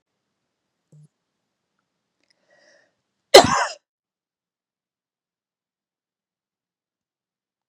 {
  "cough_length": "7.7 s",
  "cough_amplitude": 32768,
  "cough_signal_mean_std_ratio": 0.12,
  "survey_phase": "beta (2021-08-13 to 2022-03-07)",
  "age": "45-64",
  "gender": "Female",
  "wearing_mask": "No",
  "symptom_runny_or_blocked_nose": true,
  "smoker_status": "Never smoked",
  "respiratory_condition_asthma": false,
  "respiratory_condition_other": false,
  "recruitment_source": "Test and Trace",
  "submission_delay": "2 days",
  "covid_test_result": "Positive",
  "covid_test_method": "RT-qPCR",
  "covid_ct_value": 22.7,
  "covid_ct_gene": "ORF1ab gene",
  "covid_ct_mean": 23.5,
  "covid_viral_load": "20000 copies/ml",
  "covid_viral_load_category": "Low viral load (10K-1M copies/ml)"
}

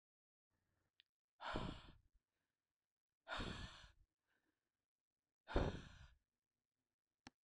{
  "exhalation_length": "7.4 s",
  "exhalation_amplitude": 1813,
  "exhalation_signal_mean_std_ratio": 0.29,
  "survey_phase": "beta (2021-08-13 to 2022-03-07)",
  "age": "45-64",
  "gender": "Female",
  "wearing_mask": "No",
  "symptom_none": true,
  "symptom_onset": "5 days",
  "smoker_status": "Never smoked",
  "respiratory_condition_asthma": false,
  "respiratory_condition_other": false,
  "recruitment_source": "REACT",
  "submission_delay": "1 day",
  "covid_test_result": "Negative",
  "covid_test_method": "RT-qPCR",
  "influenza_a_test_result": "Unknown/Void",
  "influenza_b_test_result": "Unknown/Void"
}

